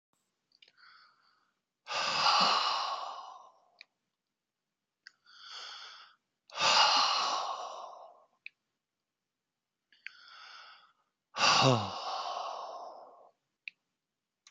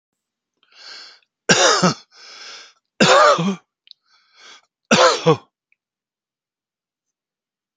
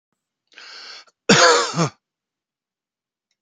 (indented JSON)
{
  "exhalation_length": "14.5 s",
  "exhalation_amplitude": 7873,
  "exhalation_signal_mean_std_ratio": 0.4,
  "three_cough_length": "7.8 s",
  "three_cough_amplitude": 31464,
  "three_cough_signal_mean_std_ratio": 0.34,
  "cough_length": "3.4 s",
  "cough_amplitude": 32767,
  "cough_signal_mean_std_ratio": 0.32,
  "survey_phase": "beta (2021-08-13 to 2022-03-07)",
  "age": "65+",
  "gender": "Male",
  "wearing_mask": "No",
  "symptom_none": true,
  "smoker_status": "Ex-smoker",
  "respiratory_condition_asthma": false,
  "respiratory_condition_other": false,
  "recruitment_source": "REACT",
  "submission_delay": "3 days",
  "covid_test_result": "Negative",
  "covid_test_method": "RT-qPCR",
  "influenza_a_test_result": "Negative",
  "influenza_b_test_result": "Negative"
}